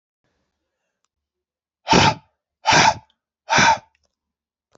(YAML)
exhalation_length: 4.8 s
exhalation_amplitude: 27438
exhalation_signal_mean_std_ratio: 0.33
survey_phase: beta (2021-08-13 to 2022-03-07)
age: 45-64
gender: Male
wearing_mask: 'No'
symptom_cough_any: true
symptom_new_continuous_cough: true
symptom_runny_or_blocked_nose: true
symptom_fatigue: true
symptom_onset: 5 days
smoker_status: Never smoked
respiratory_condition_asthma: false
respiratory_condition_other: false
recruitment_source: Test and Trace
submission_delay: 2 days
covid_test_result: Positive
covid_test_method: RT-qPCR
covid_ct_value: 24.2
covid_ct_gene: N gene